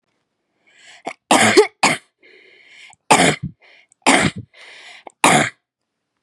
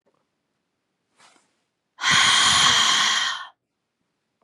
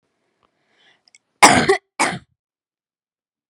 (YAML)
three_cough_length: 6.2 s
three_cough_amplitude: 32768
three_cough_signal_mean_std_ratio: 0.37
exhalation_length: 4.4 s
exhalation_amplitude: 20000
exhalation_signal_mean_std_ratio: 0.48
cough_length: 3.5 s
cough_amplitude: 32768
cough_signal_mean_std_ratio: 0.26
survey_phase: beta (2021-08-13 to 2022-03-07)
age: 18-44
gender: Female
wearing_mask: 'No'
symptom_cough_any: true
symptom_runny_or_blocked_nose: true
symptom_fatigue: true
symptom_onset: 3 days
smoker_status: Never smoked
respiratory_condition_asthma: false
respiratory_condition_other: true
recruitment_source: Test and Trace
submission_delay: 2 days
covid_test_result: Positive
covid_test_method: RT-qPCR
covid_ct_value: 15.9
covid_ct_gene: N gene